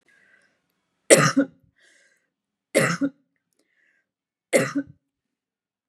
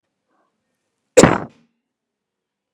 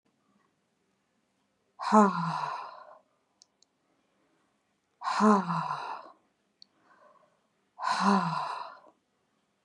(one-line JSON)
{"three_cough_length": "5.9 s", "three_cough_amplitude": 32767, "three_cough_signal_mean_std_ratio": 0.27, "cough_length": "2.7 s", "cough_amplitude": 32768, "cough_signal_mean_std_ratio": 0.2, "exhalation_length": "9.6 s", "exhalation_amplitude": 16451, "exhalation_signal_mean_std_ratio": 0.35, "survey_phase": "beta (2021-08-13 to 2022-03-07)", "age": "45-64", "gender": "Female", "wearing_mask": "No", "symptom_none": true, "smoker_status": "Current smoker (e-cigarettes or vapes only)", "respiratory_condition_asthma": false, "respiratory_condition_other": false, "recruitment_source": "REACT", "submission_delay": "2 days", "covid_test_result": "Negative", "covid_test_method": "RT-qPCR"}